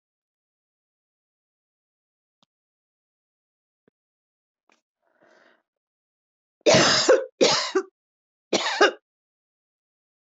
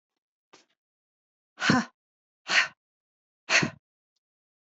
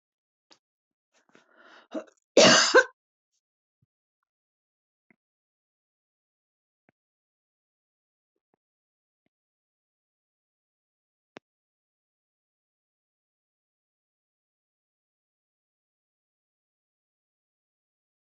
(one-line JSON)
{"three_cough_length": "10.2 s", "three_cough_amplitude": 19776, "three_cough_signal_mean_std_ratio": 0.26, "exhalation_length": "4.7 s", "exhalation_amplitude": 13303, "exhalation_signal_mean_std_ratio": 0.27, "cough_length": "18.3 s", "cough_amplitude": 17366, "cough_signal_mean_std_ratio": 0.12, "survey_phase": "beta (2021-08-13 to 2022-03-07)", "age": "65+", "gender": "Female", "wearing_mask": "No", "symptom_none": true, "smoker_status": "Never smoked", "respiratory_condition_asthma": false, "respiratory_condition_other": false, "recruitment_source": "REACT", "submission_delay": "1 day", "covid_test_result": "Negative", "covid_test_method": "RT-qPCR", "influenza_a_test_result": "Negative", "influenza_b_test_result": "Negative"}